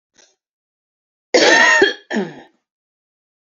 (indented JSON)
{
  "cough_length": "3.6 s",
  "cough_amplitude": 32767,
  "cough_signal_mean_std_ratio": 0.37,
  "survey_phase": "beta (2021-08-13 to 2022-03-07)",
  "age": "18-44",
  "gender": "Female",
  "wearing_mask": "No",
  "symptom_cough_any": true,
  "symptom_runny_or_blocked_nose": true,
  "symptom_sore_throat": true,
  "symptom_fatigue": true,
  "symptom_headache": true,
  "symptom_onset": "2 days",
  "smoker_status": "Never smoked",
  "respiratory_condition_asthma": false,
  "respiratory_condition_other": false,
  "recruitment_source": "Test and Trace",
  "submission_delay": "2 days",
  "covid_test_result": "Positive",
  "covid_test_method": "RT-qPCR",
  "covid_ct_value": 22.3,
  "covid_ct_gene": "ORF1ab gene"
}